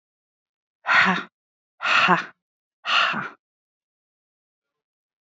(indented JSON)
{
  "exhalation_length": "5.2 s",
  "exhalation_amplitude": 26604,
  "exhalation_signal_mean_std_ratio": 0.37,
  "survey_phase": "beta (2021-08-13 to 2022-03-07)",
  "age": "18-44",
  "gender": "Female",
  "wearing_mask": "No",
  "symptom_cough_any": true,
  "symptom_new_continuous_cough": true,
  "symptom_runny_or_blocked_nose": true,
  "symptom_sore_throat": true,
  "symptom_fatigue": true,
  "symptom_fever_high_temperature": true,
  "symptom_headache": true,
  "symptom_onset": "2 days",
  "smoker_status": "Ex-smoker",
  "respiratory_condition_asthma": false,
  "respiratory_condition_other": false,
  "recruitment_source": "Test and Trace",
  "submission_delay": "1 day",
  "covid_test_result": "Positive",
  "covid_test_method": "RT-qPCR",
  "covid_ct_value": 19.2,
  "covid_ct_gene": "ORF1ab gene"
}